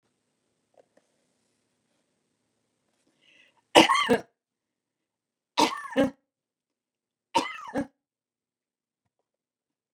{"three_cough_length": "9.9 s", "three_cough_amplitude": 31666, "three_cough_signal_mean_std_ratio": 0.21, "survey_phase": "beta (2021-08-13 to 2022-03-07)", "age": "65+", "gender": "Female", "wearing_mask": "No", "symptom_none": true, "smoker_status": "Never smoked", "respiratory_condition_asthma": false, "respiratory_condition_other": false, "recruitment_source": "REACT", "submission_delay": "2 days", "covid_test_result": "Negative", "covid_test_method": "RT-qPCR", "influenza_a_test_result": "Negative", "influenza_b_test_result": "Negative"}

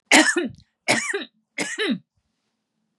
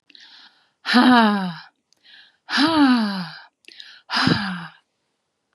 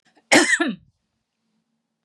{"three_cough_length": "3.0 s", "three_cough_amplitude": 28284, "three_cough_signal_mean_std_ratio": 0.42, "exhalation_length": "5.5 s", "exhalation_amplitude": 30282, "exhalation_signal_mean_std_ratio": 0.49, "cough_length": "2.0 s", "cough_amplitude": 29633, "cough_signal_mean_std_ratio": 0.33, "survey_phase": "beta (2021-08-13 to 2022-03-07)", "age": "65+", "gender": "Female", "wearing_mask": "No", "symptom_none": true, "smoker_status": "Never smoked", "respiratory_condition_asthma": true, "respiratory_condition_other": false, "recruitment_source": "REACT", "submission_delay": "1 day", "covid_test_result": "Negative", "covid_test_method": "RT-qPCR", "influenza_a_test_result": "Negative", "influenza_b_test_result": "Negative"}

